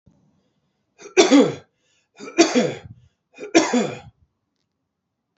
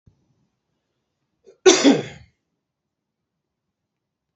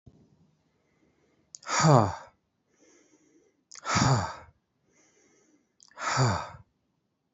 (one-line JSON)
{"three_cough_length": "5.4 s", "three_cough_amplitude": 28399, "three_cough_signal_mean_std_ratio": 0.34, "cough_length": "4.4 s", "cough_amplitude": 29772, "cough_signal_mean_std_ratio": 0.21, "exhalation_length": "7.3 s", "exhalation_amplitude": 16658, "exhalation_signal_mean_std_ratio": 0.33, "survey_phase": "beta (2021-08-13 to 2022-03-07)", "age": "18-44", "gender": "Male", "wearing_mask": "No", "symptom_none": true, "smoker_status": "Never smoked", "respiratory_condition_asthma": false, "respiratory_condition_other": false, "recruitment_source": "REACT", "submission_delay": "1 day", "covid_test_result": "Negative", "covid_test_method": "RT-qPCR", "influenza_a_test_result": "Unknown/Void", "influenza_b_test_result": "Unknown/Void"}